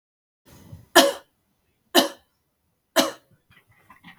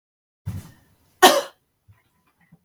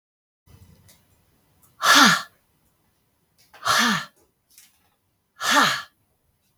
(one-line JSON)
{"three_cough_length": "4.2 s", "three_cough_amplitude": 32768, "three_cough_signal_mean_std_ratio": 0.24, "cough_length": "2.6 s", "cough_amplitude": 32768, "cough_signal_mean_std_ratio": 0.22, "exhalation_length": "6.6 s", "exhalation_amplitude": 27275, "exhalation_signal_mean_std_ratio": 0.33, "survey_phase": "beta (2021-08-13 to 2022-03-07)", "age": "45-64", "gender": "Female", "wearing_mask": "No", "symptom_none": true, "smoker_status": "Never smoked", "respiratory_condition_asthma": false, "respiratory_condition_other": false, "recruitment_source": "REACT", "submission_delay": "1 day", "covid_test_result": "Negative", "covid_test_method": "RT-qPCR", "influenza_a_test_result": "Negative", "influenza_b_test_result": "Negative"}